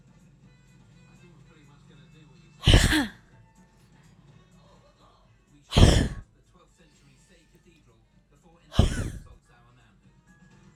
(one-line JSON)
{"exhalation_length": "10.8 s", "exhalation_amplitude": 26044, "exhalation_signal_mean_std_ratio": 0.25, "survey_phase": "alpha (2021-03-01 to 2021-08-12)", "age": "18-44", "gender": "Female", "wearing_mask": "No", "symptom_none": true, "smoker_status": "Never smoked", "respiratory_condition_asthma": true, "respiratory_condition_other": false, "recruitment_source": "REACT", "submission_delay": "4 days", "covid_test_result": "Negative", "covid_test_method": "RT-qPCR"}